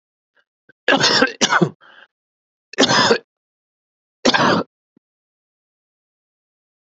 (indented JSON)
{
  "three_cough_length": "6.9 s",
  "three_cough_amplitude": 29707,
  "three_cough_signal_mean_std_ratio": 0.36,
  "survey_phase": "beta (2021-08-13 to 2022-03-07)",
  "age": "45-64",
  "gender": "Male",
  "wearing_mask": "No",
  "symptom_cough_any": true,
  "symptom_sore_throat": true,
  "symptom_fatigue": true,
  "symptom_headache": true,
  "symptom_onset": "7 days",
  "smoker_status": "Never smoked",
  "respiratory_condition_asthma": true,
  "respiratory_condition_other": false,
  "recruitment_source": "REACT",
  "submission_delay": "2 days",
  "covid_test_result": "Positive",
  "covid_test_method": "RT-qPCR",
  "covid_ct_value": 35.0,
  "covid_ct_gene": "N gene",
  "influenza_a_test_result": "Negative",
  "influenza_b_test_result": "Negative"
}